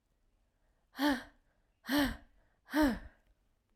{"exhalation_length": "3.8 s", "exhalation_amplitude": 3871, "exhalation_signal_mean_std_ratio": 0.38, "survey_phase": "alpha (2021-03-01 to 2021-08-12)", "age": "18-44", "gender": "Female", "wearing_mask": "No", "symptom_cough_any": true, "symptom_onset": "4 days", "smoker_status": "Never smoked", "respiratory_condition_asthma": false, "respiratory_condition_other": false, "recruitment_source": "Test and Trace", "submission_delay": "2 days", "covid_test_result": "Positive", "covid_test_method": "ePCR"}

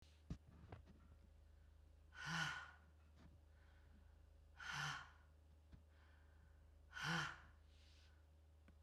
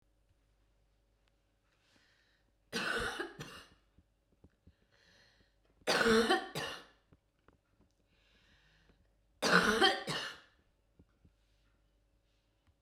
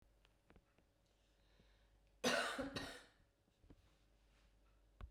{"exhalation_length": "8.8 s", "exhalation_amplitude": 793, "exhalation_signal_mean_std_ratio": 0.52, "three_cough_length": "12.8 s", "three_cough_amplitude": 8918, "three_cough_signal_mean_std_ratio": 0.31, "cough_length": "5.1 s", "cough_amplitude": 1912, "cough_signal_mean_std_ratio": 0.32, "survey_phase": "beta (2021-08-13 to 2022-03-07)", "age": "65+", "gender": "Female", "wearing_mask": "No", "symptom_cough_any": true, "symptom_onset": "7 days", "smoker_status": "Never smoked", "respiratory_condition_asthma": false, "respiratory_condition_other": false, "recruitment_source": "Test and Trace", "submission_delay": "1 day", "covid_test_result": "Positive", "covid_test_method": "RT-qPCR"}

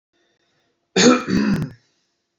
{"cough_length": "2.4 s", "cough_amplitude": 27216, "cough_signal_mean_std_ratio": 0.42, "survey_phase": "beta (2021-08-13 to 2022-03-07)", "age": "18-44", "gender": "Male", "wearing_mask": "No", "symptom_none": true, "smoker_status": "Never smoked", "respiratory_condition_asthma": false, "respiratory_condition_other": false, "recruitment_source": "REACT", "submission_delay": "1 day", "covid_test_result": "Negative", "covid_test_method": "RT-qPCR", "influenza_a_test_result": "Negative", "influenza_b_test_result": "Negative"}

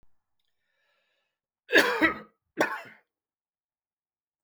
{"cough_length": "4.4 s", "cough_amplitude": 17115, "cough_signal_mean_std_ratio": 0.26, "survey_phase": "beta (2021-08-13 to 2022-03-07)", "age": "65+", "gender": "Male", "wearing_mask": "No", "symptom_none": true, "smoker_status": "Ex-smoker", "respiratory_condition_asthma": false, "respiratory_condition_other": false, "recruitment_source": "REACT", "submission_delay": "5 days", "covid_test_result": "Negative", "covid_test_method": "RT-qPCR"}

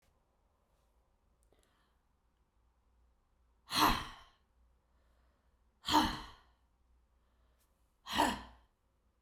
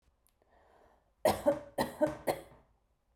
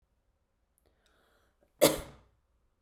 {"exhalation_length": "9.2 s", "exhalation_amplitude": 6549, "exhalation_signal_mean_std_ratio": 0.25, "three_cough_length": "3.2 s", "three_cough_amplitude": 5866, "three_cough_signal_mean_std_ratio": 0.35, "cough_length": "2.8 s", "cough_amplitude": 11684, "cough_signal_mean_std_ratio": 0.18, "survey_phase": "beta (2021-08-13 to 2022-03-07)", "age": "45-64", "gender": "Female", "wearing_mask": "No", "symptom_cough_any": true, "symptom_sore_throat": true, "symptom_fatigue": true, "symptom_onset": "5 days", "smoker_status": "Ex-smoker", "respiratory_condition_asthma": true, "respiratory_condition_other": false, "recruitment_source": "REACT", "submission_delay": "1 day", "covid_test_result": "Negative", "covid_test_method": "RT-qPCR", "influenza_a_test_result": "Negative", "influenza_b_test_result": "Negative"}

